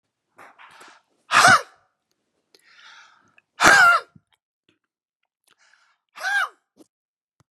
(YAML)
exhalation_length: 7.5 s
exhalation_amplitude: 32768
exhalation_signal_mean_std_ratio: 0.28
survey_phase: beta (2021-08-13 to 2022-03-07)
age: 65+
gender: Male
wearing_mask: 'No'
symptom_none: true
smoker_status: Ex-smoker
respiratory_condition_asthma: false
respiratory_condition_other: false
recruitment_source: REACT
submission_delay: 1 day
covid_test_result: Negative
covid_test_method: RT-qPCR